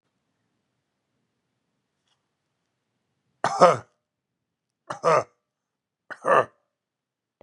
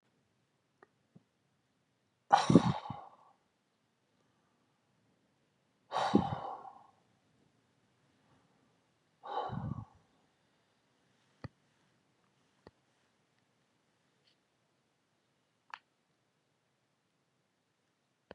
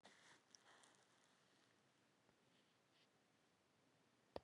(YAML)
three_cough_length: 7.4 s
three_cough_amplitude: 31147
three_cough_signal_mean_std_ratio: 0.22
exhalation_length: 18.3 s
exhalation_amplitude: 14572
exhalation_signal_mean_std_ratio: 0.18
cough_length: 4.4 s
cough_amplitude: 685
cough_signal_mean_std_ratio: 0.4
survey_phase: beta (2021-08-13 to 2022-03-07)
age: 65+
gender: Male
wearing_mask: 'No'
symptom_none: true
smoker_status: Ex-smoker
respiratory_condition_asthma: false
respiratory_condition_other: false
recruitment_source: REACT
submission_delay: 2 days
covid_test_result: Negative
covid_test_method: RT-qPCR
influenza_a_test_result: Negative
influenza_b_test_result: Negative